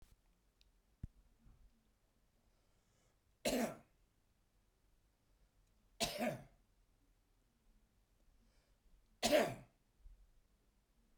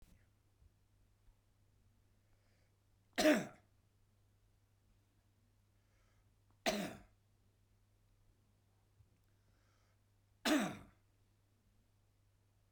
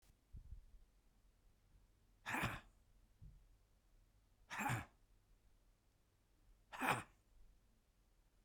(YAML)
cough_length: 11.2 s
cough_amplitude: 3172
cough_signal_mean_std_ratio: 0.25
three_cough_length: 12.7 s
three_cough_amplitude: 3561
three_cough_signal_mean_std_ratio: 0.22
exhalation_length: 8.4 s
exhalation_amplitude: 2831
exhalation_signal_mean_std_ratio: 0.34
survey_phase: beta (2021-08-13 to 2022-03-07)
age: 65+
gender: Male
wearing_mask: 'No'
symptom_cough_any: true
symptom_shortness_of_breath: true
symptom_fatigue: true
symptom_headache: true
symptom_onset: 12 days
smoker_status: Ex-smoker
respiratory_condition_asthma: true
respiratory_condition_other: false
recruitment_source: REACT
submission_delay: 5 days
covid_test_result: Negative
covid_test_method: RT-qPCR